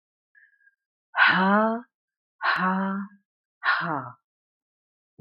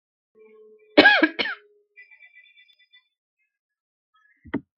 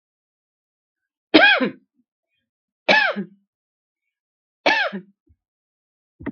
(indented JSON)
{
  "exhalation_length": "5.2 s",
  "exhalation_amplitude": 16294,
  "exhalation_signal_mean_std_ratio": 0.46,
  "cough_length": "4.8 s",
  "cough_amplitude": 32768,
  "cough_signal_mean_std_ratio": 0.23,
  "three_cough_length": "6.3 s",
  "three_cough_amplitude": 32768,
  "three_cough_signal_mean_std_ratio": 0.29,
  "survey_phase": "beta (2021-08-13 to 2022-03-07)",
  "age": "45-64",
  "gender": "Female",
  "wearing_mask": "No",
  "symptom_fatigue": true,
  "symptom_onset": "12 days",
  "smoker_status": "Never smoked",
  "respiratory_condition_asthma": false,
  "respiratory_condition_other": false,
  "recruitment_source": "REACT",
  "submission_delay": "5 days",
  "covid_test_result": "Negative",
  "covid_test_method": "RT-qPCR",
  "influenza_a_test_result": "Negative",
  "influenza_b_test_result": "Negative"
}